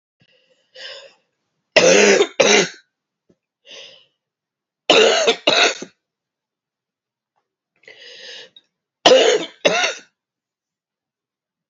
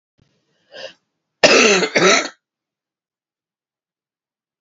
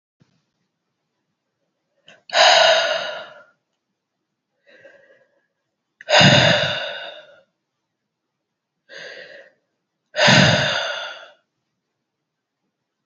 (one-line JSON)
{"three_cough_length": "11.7 s", "three_cough_amplitude": 32768, "three_cough_signal_mean_std_ratio": 0.35, "cough_length": "4.6 s", "cough_amplitude": 32767, "cough_signal_mean_std_ratio": 0.33, "exhalation_length": "13.1 s", "exhalation_amplitude": 30099, "exhalation_signal_mean_std_ratio": 0.34, "survey_phase": "beta (2021-08-13 to 2022-03-07)", "age": "45-64", "gender": "Female", "wearing_mask": "No", "symptom_cough_any": true, "symptom_runny_or_blocked_nose": true, "symptom_shortness_of_breath": true, "symptom_headache": true, "smoker_status": "Never smoked", "respiratory_condition_asthma": false, "respiratory_condition_other": false, "recruitment_source": "Test and Trace", "submission_delay": "1 day", "covid_test_result": "Positive", "covid_test_method": "RT-qPCR", "covid_ct_value": 23.4, "covid_ct_gene": "ORF1ab gene"}